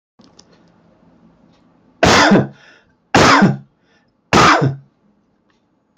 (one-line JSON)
{"three_cough_length": "6.0 s", "three_cough_amplitude": 31184, "three_cough_signal_mean_std_ratio": 0.4, "survey_phase": "beta (2021-08-13 to 2022-03-07)", "age": "45-64", "gender": "Male", "wearing_mask": "No", "symptom_runny_or_blocked_nose": true, "smoker_status": "Never smoked", "respiratory_condition_asthma": false, "respiratory_condition_other": false, "recruitment_source": "REACT", "submission_delay": "1 day", "covid_test_result": "Negative", "covid_test_method": "RT-qPCR"}